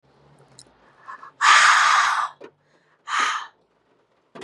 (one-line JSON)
{"exhalation_length": "4.4 s", "exhalation_amplitude": 24113, "exhalation_signal_mean_std_ratio": 0.43, "survey_phase": "beta (2021-08-13 to 2022-03-07)", "age": "18-44", "gender": "Female", "wearing_mask": "No", "symptom_none": true, "smoker_status": "Never smoked", "respiratory_condition_asthma": false, "respiratory_condition_other": false, "recruitment_source": "REACT", "submission_delay": "1 day", "covid_test_result": "Negative", "covid_test_method": "RT-qPCR", "influenza_a_test_result": "Negative", "influenza_b_test_result": "Negative"}